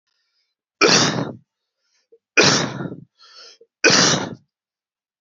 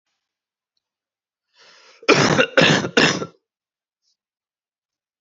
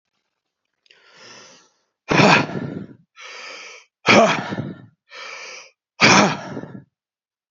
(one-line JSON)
{"three_cough_length": "5.2 s", "three_cough_amplitude": 32767, "three_cough_signal_mean_std_ratio": 0.4, "cough_length": "5.2 s", "cough_amplitude": 29171, "cough_signal_mean_std_ratio": 0.33, "exhalation_length": "7.5 s", "exhalation_amplitude": 31629, "exhalation_signal_mean_std_ratio": 0.36, "survey_phase": "beta (2021-08-13 to 2022-03-07)", "age": "18-44", "gender": "Male", "wearing_mask": "No", "symptom_cough_any": true, "symptom_runny_or_blocked_nose": true, "symptom_sore_throat": true, "symptom_change_to_sense_of_smell_or_taste": true, "symptom_loss_of_taste": true, "symptom_onset": "3 days", "smoker_status": "Never smoked", "respiratory_condition_asthma": false, "respiratory_condition_other": false, "recruitment_source": "Test and Trace", "submission_delay": "2 days", "covid_test_result": "Positive", "covid_test_method": "RT-qPCR", "covid_ct_value": 13.3, "covid_ct_gene": "N gene", "covid_ct_mean": 13.6, "covid_viral_load": "35000000 copies/ml", "covid_viral_load_category": "High viral load (>1M copies/ml)"}